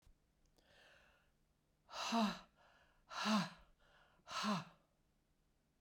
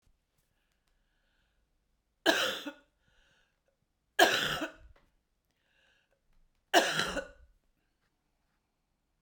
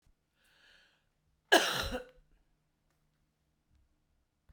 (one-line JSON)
{"exhalation_length": "5.8 s", "exhalation_amplitude": 1887, "exhalation_signal_mean_std_ratio": 0.37, "three_cough_length": "9.2 s", "three_cough_amplitude": 12195, "three_cough_signal_mean_std_ratio": 0.27, "cough_length": "4.5 s", "cough_amplitude": 10553, "cough_signal_mean_std_ratio": 0.21, "survey_phase": "beta (2021-08-13 to 2022-03-07)", "age": "65+", "gender": "Female", "wearing_mask": "No", "symptom_cough_any": true, "symptom_runny_or_blocked_nose": true, "symptom_fatigue": true, "symptom_fever_high_temperature": true, "symptom_headache": true, "symptom_onset": "3 days", "smoker_status": "Ex-smoker", "respiratory_condition_asthma": false, "respiratory_condition_other": false, "recruitment_source": "Test and Trace", "submission_delay": "2 days", "covid_test_result": "Positive", "covid_test_method": "RT-qPCR"}